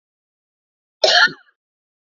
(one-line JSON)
{"cough_length": "2.0 s", "cough_amplitude": 29919, "cough_signal_mean_std_ratio": 0.29, "survey_phase": "beta (2021-08-13 to 2022-03-07)", "age": "45-64", "gender": "Female", "wearing_mask": "No", "symptom_cough_any": true, "symptom_new_continuous_cough": true, "symptom_runny_or_blocked_nose": true, "symptom_shortness_of_breath": true, "symptom_sore_throat": true, "symptom_fatigue": true, "symptom_fever_high_temperature": true, "symptom_headache": true, "symptom_onset": "2 days", "smoker_status": "Never smoked", "respiratory_condition_asthma": false, "respiratory_condition_other": false, "recruitment_source": "Test and Trace", "submission_delay": "1 day", "covid_test_result": "Positive", "covid_test_method": "ePCR"}